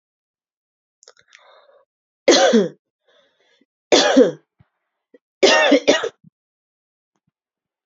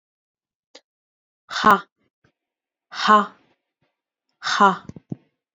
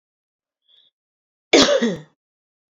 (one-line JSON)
{"three_cough_length": "7.9 s", "three_cough_amplitude": 30433, "three_cough_signal_mean_std_ratio": 0.33, "exhalation_length": "5.5 s", "exhalation_amplitude": 32175, "exhalation_signal_mean_std_ratio": 0.27, "cough_length": "2.7 s", "cough_amplitude": 30806, "cough_signal_mean_std_ratio": 0.3, "survey_phase": "beta (2021-08-13 to 2022-03-07)", "age": "18-44", "gender": "Female", "wearing_mask": "No", "symptom_cough_any": true, "symptom_runny_or_blocked_nose": true, "symptom_sore_throat": true, "symptom_onset": "3 days", "smoker_status": "Ex-smoker", "respiratory_condition_asthma": false, "respiratory_condition_other": false, "recruitment_source": "Test and Trace", "submission_delay": "2 days", "covid_test_result": "Positive", "covid_test_method": "ePCR"}